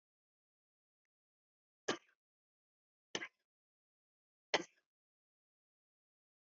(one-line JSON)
{"three_cough_length": "6.5 s", "three_cough_amplitude": 3385, "three_cough_signal_mean_std_ratio": 0.13, "survey_phase": "beta (2021-08-13 to 2022-03-07)", "age": "65+", "gender": "Female", "wearing_mask": "No", "symptom_none": true, "smoker_status": "Ex-smoker", "respiratory_condition_asthma": false, "respiratory_condition_other": false, "recruitment_source": "REACT", "submission_delay": "2 days", "covid_test_result": "Negative", "covid_test_method": "RT-qPCR", "influenza_a_test_result": "Negative", "influenza_b_test_result": "Negative"}